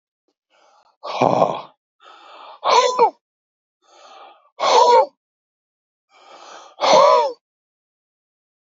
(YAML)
exhalation_length: 8.8 s
exhalation_amplitude: 32768
exhalation_signal_mean_std_ratio: 0.37
survey_phase: beta (2021-08-13 to 2022-03-07)
age: 65+
gender: Male
wearing_mask: 'No'
symptom_cough_any: true
symptom_runny_or_blocked_nose: true
symptom_sore_throat: true
symptom_headache: true
smoker_status: Ex-smoker
respiratory_condition_asthma: false
respiratory_condition_other: false
recruitment_source: REACT
submission_delay: 1 day
covid_test_result: Negative
covid_test_method: RT-qPCR